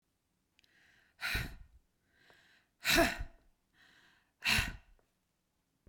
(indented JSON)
{
  "exhalation_length": "5.9 s",
  "exhalation_amplitude": 5592,
  "exhalation_signal_mean_std_ratio": 0.31,
  "survey_phase": "beta (2021-08-13 to 2022-03-07)",
  "age": "45-64",
  "gender": "Female",
  "wearing_mask": "No",
  "symptom_none": true,
  "smoker_status": "Never smoked",
  "respiratory_condition_asthma": false,
  "respiratory_condition_other": false,
  "recruitment_source": "REACT",
  "submission_delay": "2 days",
  "covid_test_result": "Negative",
  "covid_test_method": "RT-qPCR",
  "influenza_a_test_result": "Negative",
  "influenza_b_test_result": "Negative"
}